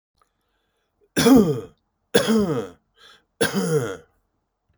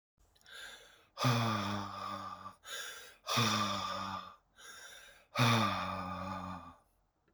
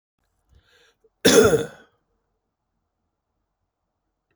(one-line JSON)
{"three_cough_length": "4.8 s", "three_cough_amplitude": 29635, "three_cough_signal_mean_std_ratio": 0.42, "exhalation_length": "7.3 s", "exhalation_amplitude": 4849, "exhalation_signal_mean_std_ratio": 0.59, "cough_length": "4.4 s", "cough_amplitude": 27669, "cough_signal_mean_std_ratio": 0.24, "survey_phase": "beta (2021-08-13 to 2022-03-07)", "age": "45-64", "gender": "Male", "wearing_mask": "No", "symptom_none": true, "symptom_onset": "8 days", "smoker_status": "Ex-smoker", "respiratory_condition_asthma": false, "respiratory_condition_other": false, "recruitment_source": "REACT", "submission_delay": "2 days", "covid_test_result": "Negative", "covid_test_method": "RT-qPCR"}